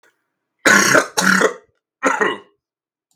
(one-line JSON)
{"three_cough_length": "3.2 s", "three_cough_amplitude": 32767, "three_cough_signal_mean_std_ratio": 0.46, "survey_phase": "beta (2021-08-13 to 2022-03-07)", "age": "18-44", "gender": "Male", "wearing_mask": "No", "symptom_cough_any": true, "symptom_new_continuous_cough": true, "symptom_runny_or_blocked_nose": true, "symptom_sore_throat": true, "symptom_fatigue": true, "symptom_fever_high_temperature": true, "symptom_headache": true, "symptom_other": true, "symptom_onset": "3 days", "smoker_status": "Never smoked", "respiratory_condition_asthma": false, "respiratory_condition_other": false, "recruitment_source": "Test and Trace", "submission_delay": "1 day", "covid_test_result": "Positive", "covid_test_method": "RT-qPCR", "covid_ct_value": 24.8, "covid_ct_gene": "N gene", "covid_ct_mean": 24.8, "covid_viral_load": "7100 copies/ml", "covid_viral_load_category": "Minimal viral load (< 10K copies/ml)"}